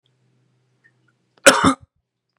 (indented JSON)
{
  "cough_length": "2.4 s",
  "cough_amplitude": 32768,
  "cough_signal_mean_std_ratio": 0.24,
  "survey_phase": "beta (2021-08-13 to 2022-03-07)",
  "age": "18-44",
  "gender": "Male",
  "wearing_mask": "No",
  "symptom_cough_any": true,
  "symptom_runny_or_blocked_nose": true,
  "symptom_sore_throat": true,
  "symptom_diarrhoea": true,
  "symptom_fatigue": true,
  "symptom_onset": "3 days",
  "smoker_status": "Never smoked",
  "respiratory_condition_asthma": false,
  "respiratory_condition_other": false,
  "recruitment_source": "Test and Trace",
  "submission_delay": "1 day",
  "covid_test_result": "Negative",
  "covid_test_method": "RT-qPCR"
}